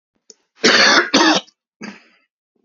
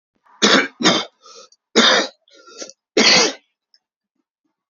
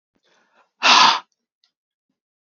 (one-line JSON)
{"cough_length": "2.6 s", "cough_amplitude": 32767, "cough_signal_mean_std_ratio": 0.45, "three_cough_length": "4.7 s", "three_cough_amplitude": 31020, "three_cough_signal_mean_std_ratio": 0.41, "exhalation_length": "2.5 s", "exhalation_amplitude": 31488, "exhalation_signal_mean_std_ratio": 0.3, "survey_phase": "beta (2021-08-13 to 2022-03-07)", "age": "18-44", "gender": "Male", "wearing_mask": "No", "symptom_cough_any": true, "symptom_sore_throat": true, "symptom_fatigue": true, "symptom_onset": "6 days", "smoker_status": "Never smoked", "respiratory_condition_asthma": false, "respiratory_condition_other": false, "recruitment_source": "Test and Trace", "submission_delay": "2 days", "covid_test_result": "Positive", "covid_test_method": "RT-qPCR", "covid_ct_value": 29.6, "covid_ct_gene": "ORF1ab gene"}